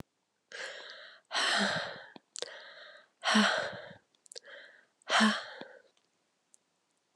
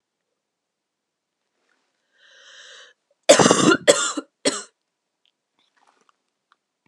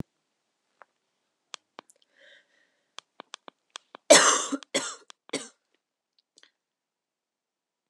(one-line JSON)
{"exhalation_length": "7.2 s", "exhalation_amplitude": 7880, "exhalation_signal_mean_std_ratio": 0.41, "cough_length": "6.9 s", "cough_amplitude": 32767, "cough_signal_mean_std_ratio": 0.25, "three_cough_length": "7.9 s", "three_cough_amplitude": 28629, "three_cough_signal_mean_std_ratio": 0.18, "survey_phase": "beta (2021-08-13 to 2022-03-07)", "age": "18-44", "gender": "Female", "wearing_mask": "No", "symptom_new_continuous_cough": true, "symptom_runny_or_blocked_nose": true, "symptom_shortness_of_breath": true, "symptom_sore_throat": true, "symptom_fatigue": true, "smoker_status": "Never smoked", "respiratory_condition_asthma": false, "respiratory_condition_other": false, "recruitment_source": "Test and Trace", "submission_delay": "0 days", "covid_test_result": "Positive", "covid_test_method": "LFT"}